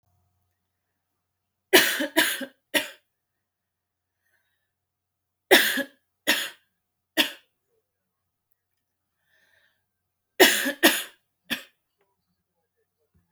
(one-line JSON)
{"three_cough_length": "13.3 s", "three_cough_amplitude": 32767, "three_cough_signal_mean_std_ratio": 0.26, "survey_phase": "alpha (2021-03-01 to 2021-08-12)", "age": "18-44", "gender": "Female", "wearing_mask": "No", "symptom_none": true, "symptom_onset": "13 days", "smoker_status": "Never smoked", "respiratory_condition_asthma": false, "respiratory_condition_other": false, "recruitment_source": "REACT", "submission_delay": "6 days", "covid_test_result": "Negative", "covid_test_method": "RT-qPCR"}